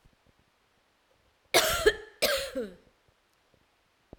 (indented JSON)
{
  "cough_length": "4.2 s",
  "cough_amplitude": 14677,
  "cough_signal_mean_std_ratio": 0.32,
  "survey_phase": "alpha (2021-03-01 to 2021-08-12)",
  "age": "45-64",
  "gender": "Female",
  "wearing_mask": "No",
  "symptom_none": true,
  "smoker_status": "Current smoker (e-cigarettes or vapes only)",
  "respiratory_condition_asthma": false,
  "respiratory_condition_other": false,
  "recruitment_source": "REACT",
  "submission_delay": "11 days",
  "covid_test_result": "Negative",
  "covid_test_method": "RT-qPCR"
}